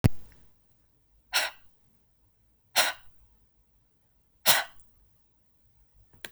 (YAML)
exhalation_length: 6.3 s
exhalation_amplitude: 20356
exhalation_signal_mean_std_ratio: 0.27
survey_phase: beta (2021-08-13 to 2022-03-07)
age: 18-44
gender: Female
wearing_mask: 'No'
symptom_none: true
smoker_status: Never smoked
respiratory_condition_asthma: false
respiratory_condition_other: false
recruitment_source: Test and Trace
submission_delay: 1 day
covid_test_result: Negative
covid_test_method: RT-qPCR